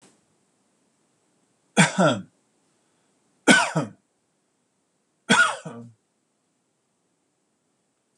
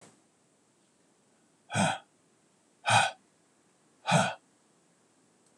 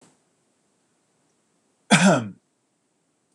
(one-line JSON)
{"three_cough_length": "8.2 s", "three_cough_amplitude": 25382, "three_cough_signal_mean_std_ratio": 0.26, "exhalation_length": "5.6 s", "exhalation_amplitude": 10787, "exhalation_signal_mean_std_ratio": 0.3, "cough_length": "3.3 s", "cough_amplitude": 23831, "cough_signal_mean_std_ratio": 0.25, "survey_phase": "beta (2021-08-13 to 2022-03-07)", "age": "45-64", "gender": "Male", "wearing_mask": "No", "symptom_none": true, "symptom_onset": "7 days", "smoker_status": "Never smoked", "respiratory_condition_asthma": false, "respiratory_condition_other": false, "recruitment_source": "Test and Trace", "submission_delay": "1 day", "covid_test_result": "Negative", "covid_test_method": "RT-qPCR"}